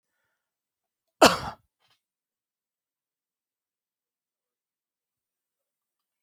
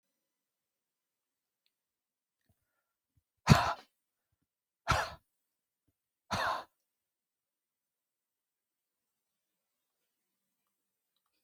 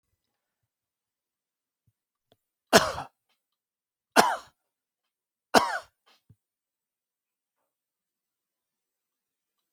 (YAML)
cough_length: 6.2 s
cough_amplitude: 28713
cough_signal_mean_std_ratio: 0.11
exhalation_length: 11.4 s
exhalation_amplitude: 14974
exhalation_signal_mean_std_ratio: 0.16
three_cough_length: 9.7 s
three_cough_amplitude: 29136
three_cough_signal_mean_std_ratio: 0.16
survey_phase: beta (2021-08-13 to 2022-03-07)
age: 65+
gender: Male
wearing_mask: 'No'
symptom_none: true
smoker_status: Never smoked
respiratory_condition_asthma: false
respiratory_condition_other: false
recruitment_source: REACT
submission_delay: 2 days
covid_test_result: Negative
covid_test_method: RT-qPCR